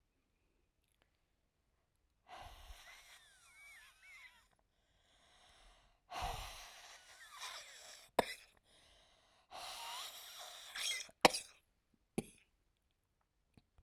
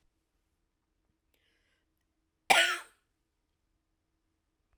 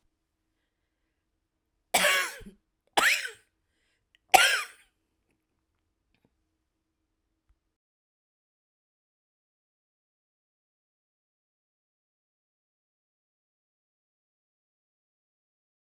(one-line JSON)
{"exhalation_length": "13.8 s", "exhalation_amplitude": 9598, "exhalation_signal_mean_std_ratio": 0.25, "cough_length": "4.8 s", "cough_amplitude": 16073, "cough_signal_mean_std_ratio": 0.18, "three_cough_length": "16.0 s", "three_cough_amplitude": 32024, "three_cough_signal_mean_std_ratio": 0.17, "survey_phase": "beta (2021-08-13 to 2022-03-07)", "age": "18-44", "gender": "Female", "wearing_mask": "No", "symptom_cough_any": true, "symptom_runny_or_blocked_nose": true, "symptom_shortness_of_breath": true, "symptom_sore_throat": true, "symptom_fatigue": true, "symptom_headache": true, "symptom_other": true, "symptom_onset": "4 days", "smoker_status": "Never smoked", "respiratory_condition_asthma": false, "respiratory_condition_other": false, "recruitment_source": "Test and Trace", "submission_delay": "1 day", "covid_test_result": "Negative", "covid_test_method": "LAMP"}